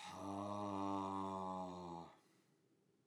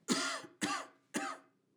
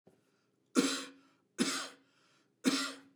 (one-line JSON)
{"exhalation_length": "3.1 s", "exhalation_amplitude": 954, "exhalation_signal_mean_std_ratio": 0.79, "cough_length": "1.8 s", "cough_amplitude": 4637, "cough_signal_mean_std_ratio": 0.56, "three_cough_length": "3.2 s", "three_cough_amplitude": 6740, "three_cough_signal_mean_std_ratio": 0.39, "survey_phase": "beta (2021-08-13 to 2022-03-07)", "age": "45-64", "gender": "Male", "wearing_mask": "No", "symptom_none": true, "smoker_status": "Never smoked", "respiratory_condition_asthma": false, "respiratory_condition_other": false, "recruitment_source": "REACT", "submission_delay": "1 day", "covid_test_result": "Negative", "covid_test_method": "RT-qPCR"}